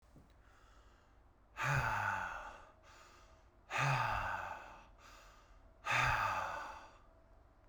exhalation_length: 7.7 s
exhalation_amplitude: 2836
exhalation_signal_mean_std_ratio: 0.54
survey_phase: beta (2021-08-13 to 2022-03-07)
age: 18-44
gender: Male
wearing_mask: 'No'
symptom_cough_any: true
symptom_new_continuous_cough: true
symptom_sore_throat: true
symptom_headache: true
symptom_onset: 3 days
smoker_status: Never smoked
respiratory_condition_asthma: false
respiratory_condition_other: false
recruitment_source: Test and Trace
submission_delay: 2 days
covid_test_result: Positive
covid_test_method: RT-qPCR
covid_ct_value: 29.4
covid_ct_gene: N gene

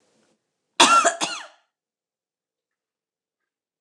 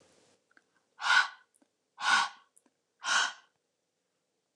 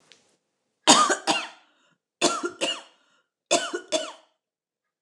cough_length: 3.8 s
cough_amplitude: 29197
cough_signal_mean_std_ratio: 0.26
exhalation_length: 4.6 s
exhalation_amplitude: 8385
exhalation_signal_mean_std_ratio: 0.33
three_cough_length: 5.0 s
three_cough_amplitude: 29079
three_cough_signal_mean_std_ratio: 0.36
survey_phase: beta (2021-08-13 to 2022-03-07)
age: 45-64
gender: Female
wearing_mask: 'No'
symptom_none: true
symptom_onset: 7 days
smoker_status: Never smoked
respiratory_condition_asthma: false
respiratory_condition_other: false
recruitment_source: REACT
submission_delay: 7 days
covid_test_result: Negative
covid_test_method: RT-qPCR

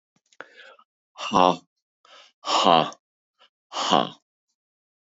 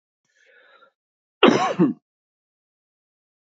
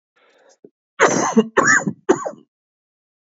exhalation_length: 5.1 s
exhalation_amplitude: 29444
exhalation_signal_mean_std_ratio: 0.3
cough_length: 3.6 s
cough_amplitude: 28979
cough_signal_mean_std_ratio: 0.26
three_cough_length: 3.2 s
three_cough_amplitude: 31985
three_cough_signal_mean_std_ratio: 0.41
survey_phase: beta (2021-08-13 to 2022-03-07)
age: 45-64
gender: Male
wearing_mask: 'No'
symptom_cough_any: true
symptom_runny_or_blocked_nose: true
symptom_fatigue: true
symptom_other: true
symptom_onset: 2 days
smoker_status: Never smoked
respiratory_condition_asthma: false
respiratory_condition_other: false
recruitment_source: Test and Trace
submission_delay: 1 day
covid_test_result: Positive
covid_test_method: RT-qPCR
covid_ct_value: 15.7
covid_ct_gene: N gene
covid_ct_mean: 16.9
covid_viral_load: 2800000 copies/ml
covid_viral_load_category: High viral load (>1M copies/ml)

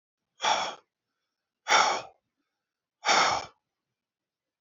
exhalation_length: 4.6 s
exhalation_amplitude: 12967
exhalation_signal_mean_std_ratio: 0.36
survey_phase: beta (2021-08-13 to 2022-03-07)
age: 45-64
gender: Male
wearing_mask: 'No'
symptom_runny_or_blocked_nose: true
symptom_sore_throat: true
smoker_status: Ex-smoker
respiratory_condition_asthma: false
respiratory_condition_other: false
recruitment_source: REACT
submission_delay: 1 day
covid_test_result: Negative
covid_test_method: RT-qPCR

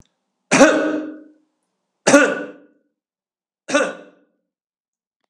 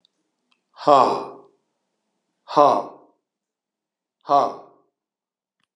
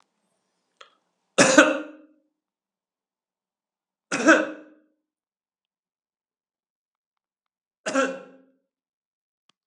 three_cough_length: 5.3 s
three_cough_amplitude: 32768
three_cough_signal_mean_std_ratio: 0.33
exhalation_length: 5.8 s
exhalation_amplitude: 30978
exhalation_signal_mean_std_ratio: 0.28
cough_length: 9.7 s
cough_amplitude: 32730
cough_signal_mean_std_ratio: 0.22
survey_phase: alpha (2021-03-01 to 2021-08-12)
age: 65+
gender: Male
wearing_mask: 'No'
symptom_cough_any: true
symptom_fatigue: true
symptom_onset: 12 days
smoker_status: Ex-smoker
respiratory_condition_asthma: false
respiratory_condition_other: false
recruitment_source: REACT
submission_delay: 2 days
covid_test_result: Negative
covid_test_method: RT-qPCR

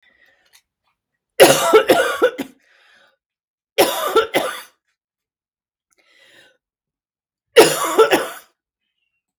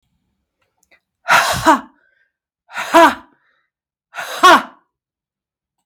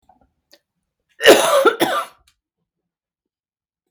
three_cough_length: 9.4 s
three_cough_amplitude: 32768
three_cough_signal_mean_std_ratio: 0.34
exhalation_length: 5.9 s
exhalation_amplitude: 32768
exhalation_signal_mean_std_ratio: 0.33
cough_length: 3.9 s
cough_amplitude: 32768
cough_signal_mean_std_ratio: 0.31
survey_phase: beta (2021-08-13 to 2022-03-07)
age: 45-64
gender: Female
wearing_mask: 'No'
symptom_cough_any: true
symptom_runny_or_blocked_nose: true
symptom_shortness_of_breath: true
symptom_sore_throat: true
symptom_fatigue: true
symptom_headache: true
symptom_onset: 5 days
smoker_status: Never smoked
respiratory_condition_asthma: false
respiratory_condition_other: false
recruitment_source: Test and Trace
submission_delay: 2 days
covid_test_result: Positive
covid_test_method: RT-qPCR
covid_ct_value: 19.4
covid_ct_gene: ORF1ab gene
covid_ct_mean: 19.7
covid_viral_load: 340000 copies/ml
covid_viral_load_category: Low viral load (10K-1M copies/ml)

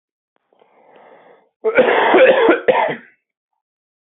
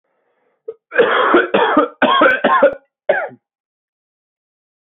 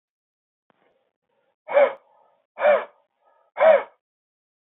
cough_length: 4.2 s
cough_amplitude: 27360
cough_signal_mean_std_ratio: 0.45
three_cough_length: 4.9 s
three_cough_amplitude: 27736
three_cough_signal_mean_std_ratio: 0.5
exhalation_length: 4.6 s
exhalation_amplitude: 19071
exhalation_signal_mean_std_ratio: 0.3
survey_phase: beta (2021-08-13 to 2022-03-07)
age: 18-44
gender: Male
wearing_mask: 'No'
symptom_cough_any: true
symptom_runny_or_blocked_nose: true
symptom_sore_throat: true
symptom_onset: 4 days
smoker_status: Never smoked
respiratory_condition_asthma: false
respiratory_condition_other: false
recruitment_source: Test and Trace
submission_delay: 3 days
covid_test_result: Positive
covid_test_method: RT-qPCR
covid_ct_value: 17.1
covid_ct_gene: N gene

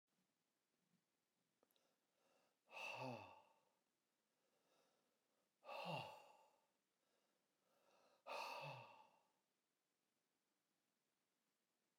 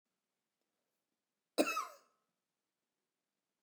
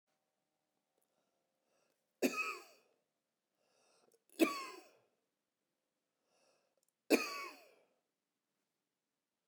exhalation_length: 12.0 s
exhalation_amplitude: 413
exhalation_signal_mean_std_ratio: 0.34
cough_length: 3.6 s
cough_amplitude: 4954
cough_signal_mean_std_ratio: 0.2
three_cough_length: 9.5 s
three_cough_amplitude: 5701
three_cough_signal_mean_std_ratio: 0.21
survey_phase: beta (2021-08-13 to 2022-03-07)
age: 45-64
gender: Male
wearing_mask: 'Yes'
symptom_none: true
smoker_status: Never smoked
respiratory_condition_asthma: false
respiratory_condition_other: false
recruitment_source: REACT
submission_delay: 1 day
covid_test_result: Negative
covid_test_method: RT-qPCR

